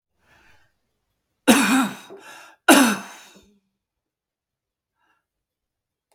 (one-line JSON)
{"cough_length": "6.1 s", "cough_amplitude": 32767, "cough_signal_mean_std_ratio": 0.27, "survey_phase": "beta (2021-08-13 to 2022-03-07)", "age": "65+", "gender": "Male", "wearing_mask": "No", "symptom_none": true, "smoker_status": "Never smoked", "respiratory_condition_asthma": false, "respiratory_condition_other": false, "recruitment_source": "REACT", "submission_delay": "0 days", "covid_test_result": "Negative", "covid_test_method": "RT-qPCR"}